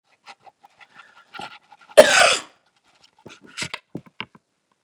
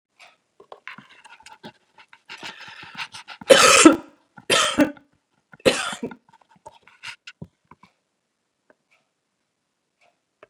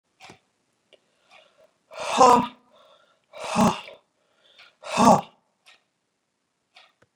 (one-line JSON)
{"cough_length": "4.8 s", "cough_amplitude": 32768, "cough_signal_mean_std_ratio": 0.23, "three_cough_length": "10.5 s", "three_cough_amplitude": 32768, "three_cough_signal_mean_std_ratio": 0.25, "exhalation_length": "7.2 s", "exhalation_amplitude": 24114, "exhalation_signal_mean_std_ratio": 0.27, "survey_phase": "beta (2021-08-13 to 2022-03-07)", "age": "65+", "gender": "Female", "wearing_mask": "No", "symptom_none": true, "smoker_status": "Never smoked", "respiratory_condition_asthma": false, "respiratory_condition_other": false, "recruitment_source": "REACT", "submission_delay": "2 days", "covid_test_result": "Negative", "covid_test_method": "RT-qPCR", "influenza_a_test_result": "Negative", "influenza_b_test_result": "Negative"}